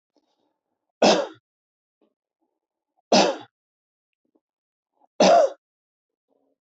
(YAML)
three_cough_length: 6.7 s
three_cough_amplitude: 20217
three_cough_signal_mean_std_ratio: 0.27
survey_phase: beta (2021-08-13 to 2022-03-07)
age: 45-64
gender: Male
wearing_mask: 'No'
symptom_none: true
smoker_status: Never smoked
respiratory_condition_asthma: false
respiratory_condition_other: false
recruitment_source: REACT
submission_delay: 2 days
covid_test_result: Negative
covid_test_method: RT-qPCR
influenza_a_test_result: Unknown/Void
influenza_b_test_result: Unknown/Void